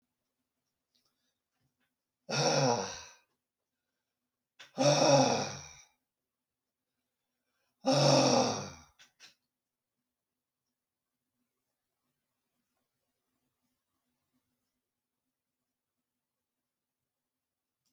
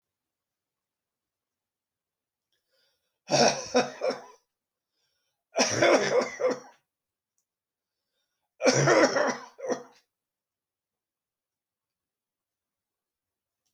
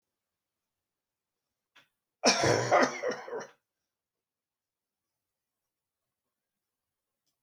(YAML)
exhalation_length: 17.9 s
exhalation_amplitude: 8094
exhalation_signal_mean_std_ratio: 0.27
three_cough_length: 13.7 s
three_cough_amplitude: 15640
three_cough_signal_mean_std_ratio: 0.32
cough_length: 7.4 s
cough_amplitude: 10601
cough_signal_mean_std_ratio: 0.26
survey_phase: beta (2021-08-13 to 2022-03-07)
age: 65+
gender: Male
wearing_mask: 'No'
symptom_none: true
smoker_status: Ex-smoker
respiratory_condition_asthma: false
respiratory_condition_other: false
recruitment_source: REACT
submission_delay: 1 day
covid_test_result: Negative
covid_test_method: RT-qPCR